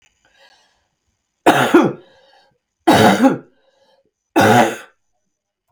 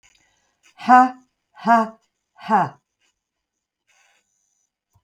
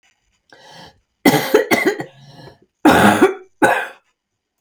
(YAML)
three_cough_length: 5.7 s
three_cough_amplitude: 32768
three_cough_signal_mean_std_ratio: 0.39
exhalation_length: 5.0 s
exhalation_amplitude: 29847
exhalation_signal_mean_std_ratio: 0.28
cough_length: 4.6 s
cough_amplitude: 32768
cough_signal_mean_std_ratio: 0.43
survey_phase: beta (2021-08-13 to 2022-03-07)
age: 45-64
gender: Female
wearing_mask: 'No'
symptom_none: true
smoker_status: Never smoked
respiratory_condition_asthma: false
respiratory_condition_other: false
recruitment_source: REACT
submission_delay: 2 days
covid_test_result: Negative
covid_test_method: RT-qPCR
influenza_a_test_result: Negative
influenza_b_test_result: Negative